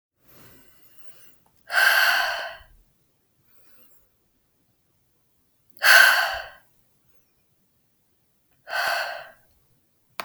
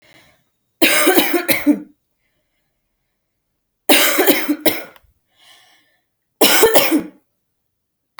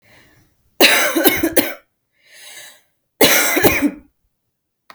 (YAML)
exhalation_length: 10.2 s
exhalation_amplitude: 29647
exhalation_signal_mean_std_ratio: 0.31
three_cough_length: 8.2 s
three_cough_amplitude: 32768
three_cough_signal_mean_std_ratio: 0.42
cough_length: 4.9 s
cough_amplitude: 32768
cough_signal_mean_std_ratio: 0.45
survey_phase: alpha (2021-03-01 to 2021-08-12)
age: 18-44
gender: Female
wearing_mask: 'No'
symptom_none: true
smoker_status: Never smoked
respiratory_condition_asthma: false
respiratory_condition_other: false
recruitment_source: REACT
submission_delay: 1 day
covid_test_result: Negative
covid_test_method: RT-qPCR